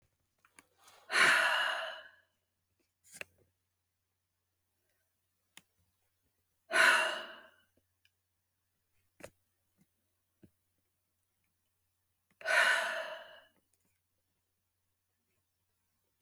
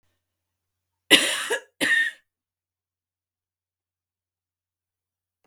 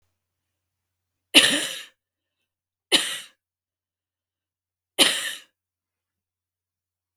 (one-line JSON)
{"exhalation_length": "16.2 s", "exhalation_amplitude": 6806, "exhalation_signal_mean_std_ratio": 0.27, "cough_length": "5.5 s", "cough_amplitude": 32768, "cough_signal_mean_std_ratio": 0.26, "three_cough_length": "7.2 s", "three_cough_amplitude": 32768, "three_cough_signal_mean_std_ratio": 0.24, "survey_phase": "beta (2021-08-13 to 2022-03-07)", "age": "45-64", "gender": "Female", "wearing_mask": "No", "symptom_none": true, "smoker_status": "Ex-smoker", "respiratory_condition_asthma": true, "respiratory_condition_other": false, "recruitment_source": "REACT", "submission_delay": "3 days", "covid_test_result": "Negative", "covid_test_method": "RT-qPCR"}